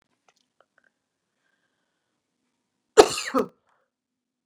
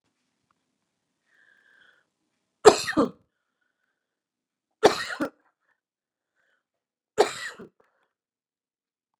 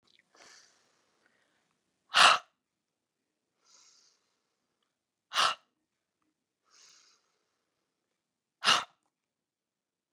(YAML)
cough_length: 4.5 s
cough_amplitude: 32768
cough_signal_mean_std_ratio: 0.15
three_cough_length: 9.2 s
three_cough_amplitude: 32767
three_cough_signal_mean_std_ratio: 0.17
exhalation_length: 10.1 s
exhalation_amplitude: 15342
exhalation_signal_mean_std_ratio: 0.18
survey_phase: beta (2021-08-13 to 2022-03-07)
age: 45-64
gender: Female
wearing_mask: 'No'
symptom_cough_any: true
symptom_runny_or_blocked_nose: true
symptom_sore_throat: true
symptom_fatigue: true
symptom_headache: true
symptom_change_to_sense_of_smell_or_taste: true
symptom_onset: 3 days
smoker_status: Never smoked
respiratory_condition_asthma: false
respiratory_condition_other: false
recruitment_source: Test and Trace
submission_delay: 0 days
covid_test_result: Positive
covid_test_method: RT-qPCR
covid_ct_value: 16.3
covid_ct_gene: ORF1ab gene
covid_ct_mean: 18.7
covid_viral_load: 740000 copies/ml
covid_viral_load_category: Low viral load (10K-1M copies/ml)